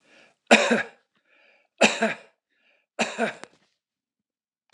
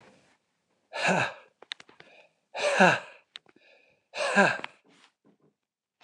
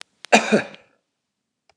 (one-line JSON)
{"three_cough_length": "4.7 s", "three_cough_amplitude": 29203, "three_cough_signal_mean_std_ratio": 0.3, "exhalation_length": "6.0 s", "exhalation_amplitude": 16342, "exhalation_signal_mean_std_ratio": 0.33, "cough_length": "1.8 s", "cough_amplitude": 29204, "cough_signal_mean_std_ratio": 0.28, "survey_phase": "beta (2021-08-13 to 2022-03-07)", "age": "65+", "gender": "Male", "wearing_mask": "No", "symptom_none": true, "smoker_status": "Never smoked", "respiratory_condition_asthma": false, "respiratory_condition_other": false, "recruitment_source": "REACT", "submission_delay": "1 day", "covid_test_result": "Negative", "covid_test_method": "RT-qPCR", "influenza_a_test_result": "Negative", "influenza_b_test_result": "Negative"}